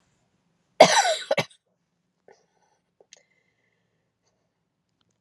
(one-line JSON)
{"cough_length": "5.2 s", "cough_amplitude": 32767, "cough_signal_mean_std_ratio": 0.2, "survey_phase": "beta (2021-08-13 to 2022-03-07)", "age": "18-44", "gender": "Female", "wearing_mask": "No", "symptom_cough_any": true, "symptom_new_continuous_cough": true, "symptom_runny_or_blocked_nose": true, "symptom_shortness_of_breath": true, "symptom_diarrhoea": true, "symptom_fatigue": true, "symptom_fever_high_temperature": true, "symptom_headache": true, "symptom_change_to_sense_of_smell_or_taste": true, "symptom_other": true, "symptom_onset": "3 days", "smoker_status": "Never smoked", "respiratory_condition_asthma": true, "respiratory_condition_other": false, "recruitment_source": "Test and Trace", "submission_delay": "1 day", "covid_test_result": "Positive", "covid_test_method": "ePCR"}